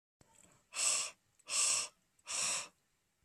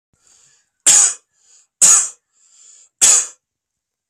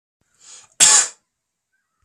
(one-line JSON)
{"exhalation_length": "3.2 s", "exhalation_amplitude": 3707, "exhalation_signal_mean_std_ratio": 0.49, "three_cough_length": "4.1 s", "three_cough_amplitude": 32768, "three_cough_signal_mean_std_ratio": 0.35, "cough_length": "2.0 s", "cough_amplitude": 32768, "cough_signal_mean_std_ratio": 0.29, "survey_phase": "beta (2021-08-13 to 2022-03-07)", "age": "18-44", "gender": "Male", "wearing_mask": "No", "symptom_none": true, "smoker_status": "Ex-smoker", "respiratory_condition_asthma": false, "respiratory_condition_other": false, "recruitment_source": "Test and Trace", "submission_delay": "-1 day", "covid_test_result": "Negative", "covid_test_method": "LFT"}